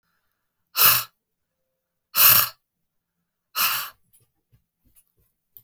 exhalation_length: 5.6 s
exhalation_amplitude: 32766
exhalation_signal_mean_std_ratio: 0.29
survey_phase: beta (2021-08-13 to 2022-03-07)
age: 45-64
gender: Female
wearing_mask: 'No'
symptom_headache: true
smoker_status: Current smoker (e-cigarettes or vapes only)
respiratory_condition_asthma: true
respiratory_condition_other: false
recruitment_source: REACT
submission_delay: 1 day
covid_test_result: Negative
covid_test_method: RT-qPCR
influenza_a_test_result: Negative
influenza_b_test_result: Negative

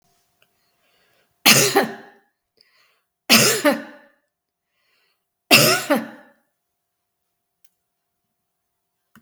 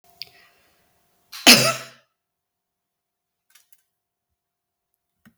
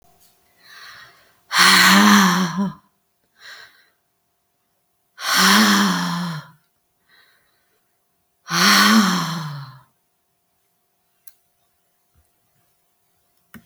three_cough_length: 9.2 s
three_cough_amplitude: 32766
three_cough_signal_mean_std_ratio: 0.29
cough_length: 5.4 s
cough_amplitude: 32768
cough_signal_mean_std_ratio: 0.17
exhalation_length: 13.7 s
exhalation_amplitude: 32766
exhalation_signal_mean_std_ratio: 0.4
survey_phase: beta (2021-08-13 to 2022-03-07)
age: 45-64
gender: Female
wearing_mask: 'No'
symptom_sore_throat: true
symptom_onset: 11 days
smoker_status: Never smoked
respiratory_condition_asthma: false
respiratory_condition_other: false
recruitment_source: REACT
submission_delay: 1 day
covid_test_result: Negative
covid_test_method: RT-qPCR
influenza_a_test_result: Negative
influenza_b_test_result: Negative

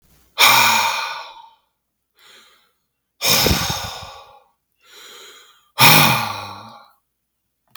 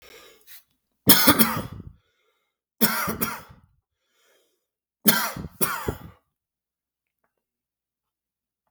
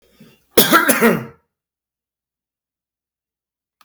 exhalation_length: 7.8 s
exhalation_amplitude: 32768
exhalation_signal_mean_std_ratio: 0.4
three_cough_length: 8.7 s
three_cough_amplitude: 32768
three_cough_signal_mean_std_ratio: 0.29
cough_length: 3.8 s
cough_amplitude: 32768
cough_signal_mean_std_ratio: 0.31
survey_phase: beta (2021-08-13 to 2022-03-07)
age: 45-64
gender: Male
wearing_mask: 'No'
symptom_none: true
smoker_status: Ex-smoker
respiratory_condition_asthma: false
respiratory_condition_other: false
recruitment_source: REACT
submission_delay: 0 days
covid_test_result: Negative
covid_test_method: RT-qPCR
influenza_a_test_result: Negative
influenza_b_test_result: Negative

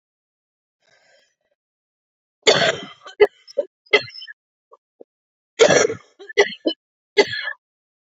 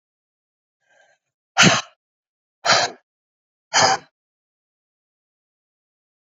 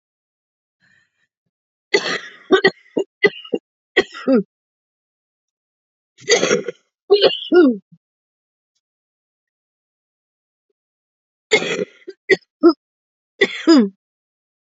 cough_length: 8.0 s
cough_amplitude: 30073
cough_signal_mean_std_ratio: 0.29
exhalation_length: 6.2 s
exhalation_amplitude: 30462
exhalation_signal_mean_std_ratio: 0.26
three_cough_length: 14.8 s
three_cough_amplitude: 32768
three_cough_signal_mean_std_ratio: 0.31
survey_phase: beta (2021-08-13 to 2022-03-07)
age: 45-64
gender: Female
wearing_mask: 'No'
symptom_cough_any: true
symptom_new_continuous_cough: true
symptom_runny_or_blocked_nose: true
symptom_shortness_of_breath: true
symptom_sore_throat: true
symptom_fatigue: true
symptom_change_to_sense_of_smell_or_taste: true
symptom_onset: 5 days
smoker_status: Never smoked
respiratory_condition_asthma: false
respiratory_condition_other: false
recruitment_source: Test and Trace
submission_delay: 0 days
covid_test_result: Negative
covid_test_method: RT-qPCR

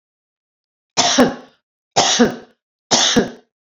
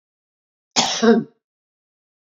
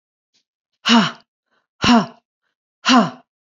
three_cough_length: 3.7 s
three_cough_amplitude: 32768
three_cough_signal_mean_std_ratio: 0.44
cough_length: 2.2 s
cough_amplitude: 26477
cough_signal_mean_std_ratio: 0.33
exhalation_length: 3.5 s
exhalation_amplitude: 28373
exhalation_signal_mean_std_ratio: 0.37
survey_phase: beta (2021-08-13 to 2022-03-07)
age: 45-64
gender: Female
wearing_mask: 'No'
symptom_none: true
smoker_status: Never smoked
respiratory_condition_asthma: false
respiratory_condition_other: false
recruitment_source: REACT
submission_delay: 2 days
covid_test_result: Negative
covid_test_method: RT-qPCR
influenza_a_test_result: Negative
influenza_b_test_result: Negative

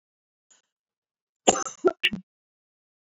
cough_length: 3.2 s
cough_amplitude: 23750
cough_signal_mean_std_ratio: 0.22
survey_phase: beta (2021-08-13 to 2022-03-07)
age: 18-44
gender: Female
wearing_mask: 'No'
symptom_none: true
smoker_status: Never smoked
respiratory_condition_asthma: false
respiratory_condition_other: false
recruitment_source: REACT
submission_delay: 1 day
covid_test_result: Negative
covid_test_method: RT-qPCR
influenza_a_test_result: Negative
influenza_b_test_result: Negative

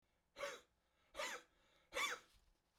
exhalation_length: 2.8 s
exhalation_amplitude: 1054
exhalation_signal_mean_std_ratio: 0.41
survey_phase: beta (2021-08-13 to 2022-03-07)
age: 65+
gender: Male
wearing_mask: 'No'
symptom_none: true
smoker_status: Ex-smoker
respiratory_condition_asthma: true
respiratory_condition_other: false
recruitment_source: REACT
submission_delay: 1 day
covid_test_result: Negative
covid_test_method: RT-qPCR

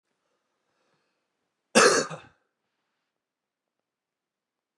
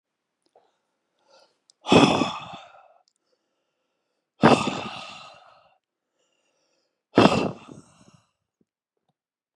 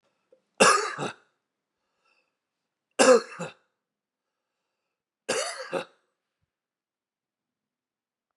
cough_length: 4.8 s
cough_amplitude: 22018
cough_signal_mean_std_ratio: 0.2
exhalation_length: 9.6 s
exhalation_amplitude: 30922
exhalation_signal_mean_std_ratio: 0.26
three_cough_length: 8.4 s
three_cough_amplitude: 19609
three_cough_signal_mean_std_ratio: 0.24
survey_phase: beta (2021-08-13 to 2022-03-07)
age: 45-64
gender: Male
wearing_mask: 'No'
symptom_runny_or_blocked_nose: true
symptom_sore_throat: true
symptom_onset: 3 days
smoker_status: Never smoked
respiratory_condition_asthma: false
respiratory_condition_other: false
recruitment_source: Test and Trace
submission_delay: 2 days
covid_test_result: Positive
covid_test_method: RT-qPCR
covid_ct_value: 28.7
covid_ct_gene: ORF1ab gene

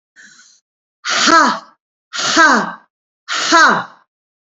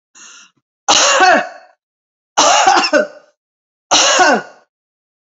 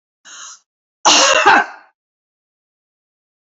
exhalation_length: 4.5 s
exhalation_amplitude: 30252
exhalation_signal_mean_std_ratio: 0.48
three_cough_length: 5.3 s
three_cough_amplitude: 32768
three_cough_signal_mean_std_ratio: 0.51
cough_length: 3.6 s
cough_amplitude: 32281
cough_signal_mean_std_ratio: 0.34
survey_phase: beta (2021-08-13 to 2022-03-07)
age: 65+
gender: Female
wearing_mask: 'No'
symptom_none: true
smoker_status: Never smoked
respiratory_condition_asthma: false
respiratory_condition_other: false
recruitment_source: REACT
submission_delay: 2 days
covid_test_result: Negative
covid_test_method: RT-qPCR
influenza_a_test_result: Negative
influenza_b_test_result: Negative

